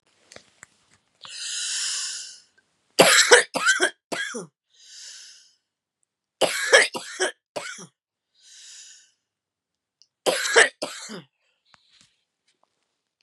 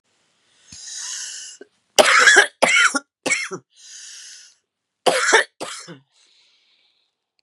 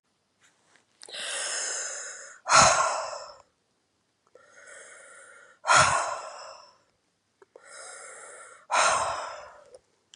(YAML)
three_cough_length: 13.2 s
three_cough_amplitude: 32767
three_cough_signal_mean_std_ratio: 0.32
cough_length: 7.4 s
cough_amplitude: 32768
cough_signal_mean_std_ratio: 0.37
exhalation_length: 10.2 s
exhalation_amplitude: 18517
exhalation_signal_mean_std_ratio: 0.39
survey_phase: beta (2021-08-13 to 2022-03-07)
age: 45-64
gender: Female
wearing_mask: 'No'
symptom_cough_any: true
symptom_shortness_of_breath: true
symptom_sore_throat: true
symptom_diarrhoea: true
symptom_fatigue: true
symptom_fever_high_temperature: true
symptom_headache: true
symptom_change_to_sense_of_smell_or_taste: true
symptom_loss_of_taste: true
symptom_other: true
symptom_onset: 5 days
smoker_status: Never smoked
respiratory_condition_asthma: false
respiratory_condition_other: true
recruitment_source: Test and Trace
submission_delay: 2 days
covid_test_result: Positive
covid_test_method: RT-qPCR